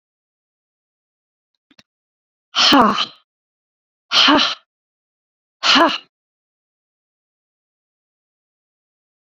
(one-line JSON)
{"exhalation_length": "9.3 s", "exhalation_amplitude": 31740, "exhalation_signal_mean_std_ratio": 0.28, "survey_phase": "beta (2021-08-13 to 2022-03-07)", "age": "45-64", "gender": "Female", "wearing_mask": "No", "symptom_none": true, "smoker_status": "Never smoked", "respiratory_condition_asthma": false, "respiratory_condition_other": false, "recruitment_source": "REACT", "submission_delay": "16 days", "covid_test_result": "Negative", "covid_test_method": "RT-qPCR"}